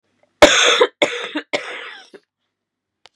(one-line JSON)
{"three_cough_length": "3.2 s", "three_cough_amplitude": 32768, "three_cough_signal_mean_std_ratio": 0.37, "survey_phase": "beta (2021-08-13 to 2022-03-07)", "age": "18-44", "gender": "Female", "wearing_mask": "No", "symptom_cough_any": true, "symptom_runny_or_blocked_nose": true, "symptom_shortness_of_breath": true, "symptom_fatigue": true, "symptom_headache": true, "symptom_onset": "3 days", "smoker_status": "Never smoked", "respiratory_condition_asthma": false, "respiratory_condition_other": false, "recruitment_source": "Test and Trace", "submission_delay": "2 days", "covid_test_result": "Positive", "covid_test_method": "RT-qPCR"}